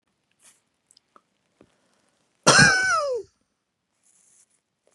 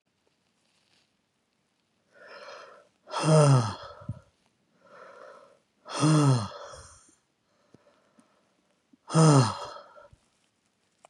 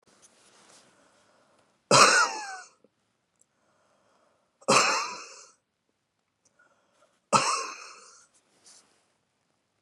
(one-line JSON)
{"cough_length": "4.9 s", "cough_amplitude": 27436, "cough_signal_mean_std_ratio": 0.29, "exhalation_length": "11.1 s", "exhalation_amplitude": 14731, "exhalation_signal_mean_std_ratio": 0.33, "three_cough_length": "9.8 s", "three_cough_amplitude": 21172, "three_cough_signal_mean_std_ratio": 0.28, "survey_phase": "beta (2021-08-13 to 2022-03-07)", "age": "45-64", "gender": "Male", "wearing_mask": "No", "symptom_runny_or_blocked_nose": true, "symptom_sore_throat": true, "symptom_headache": true, "symptom_onset": "4 days", "smoker_status": "Never smoked", "respiratory_condition_asthma": false, "respiratory_condition_other": false, "recruitment_source": "Test and Trace", "submission_delay": "2 days", "covid_test_result": "Positive", "covid_test_method": "RT-qPCR", "covid_ct_value": 17.2, "covid_ct_gene": "ORF1ab gene", "covid_ct_mean": 17.3, "covid_viral_load": "2100000 copies/ml", "covid_viral_load_category": "High viral load (>1M copies/ml)"}